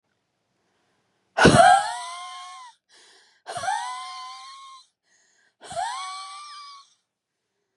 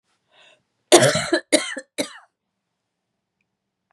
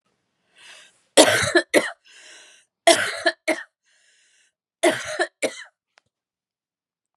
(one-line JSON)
{"exhalation_length": "7.8 s", "exhalation_amplitude": 32524, "exhalation_signal_mean_std_ratio": 0.32, "cough_length": "3.9 s", "cough_amplitude": 32768, "cough_signal_mean_std_ratio": 0.28, "three_cough_length": "7.2 s", "three_cough_amplitude": 32767, "three_cough_signal_mean_std_ratio": 0.32, "survey_phase": "beta (2021-08-13 to 2022-03-07)", "age": "45-64", "gender": "Female", "wearing_mask": "No", "symptom_cough_any": true, "symptom_shortness_of_breath": true, "symptom_sore_throat": true, "symptom_fatigue": true, "symptom_headache": true, "symptom_other": true, "symptom_onset": "3 days", "smoker_status": "Ex-smoker", "respiratory_condition_asthma": true, "respiratory_condition_other": false, "recruitment_source": "Test and Trace", "submission_delay": "1 day", "covid_test_result": "Positive", "covid_test_method": "ePCR"}